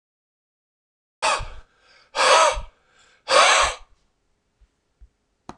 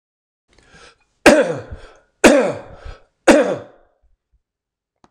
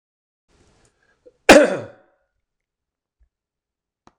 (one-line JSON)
{"exhalation_length": "5.6 s", "exhalation_amplitude": 24422, "exhalation_signal_mean_std_ratio": 0.36, "three_cough_length": "5.1 s", "three_cough_amplitude": 26028, "three_cough_signal_mean_std_ratio": 0.33, "cough_length": "4.2 s", "cough_amplitude": 26028, "cough_signal_mean_std_ratio": 0.19, "survey_phase": "beta (2021-08-13 to 2022-03-07)", "age": "45-64", "gender": "Male", "wearing_mask": "No", "symptom_none": true, "smoker_status": "Never smoked", "respiratory_condition_asthma": false, "respiratory_condition_other": false, "recruitment_source": "REACT", "submission_delay": "14 days", "covid_test_result": "Negative", "covid_test_method": "RT-qPCR"}